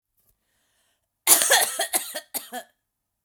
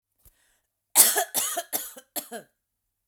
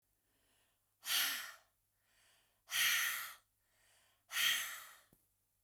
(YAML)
cough_length: 3.2 s
cough_amplitude: 31308
cough_signal_mean_std_ratio: 0.35
three_cough_length: 3.1 s
three_cough_amplitude: 30503
three_cough_signal_mean_std_ratio: 0.33
exhalation_length: 5.6 s
exhalation_amplitude: 2859
exhalation_signal_mean_std_ratio: 0.41
survey_phase: beta (2021-08-13 to 2022-03-07)
age: 45-64
gender: Female
wearing_mask: 'No'
symptom_none: true
smoker_status: Never smoked
respiratory_condition_asthma: false
respiratory_condition_other: false
recruitment_source: REACT
submission_delay: 0 days
covid_test_result: Negative
covid_test_method: RT-qPCR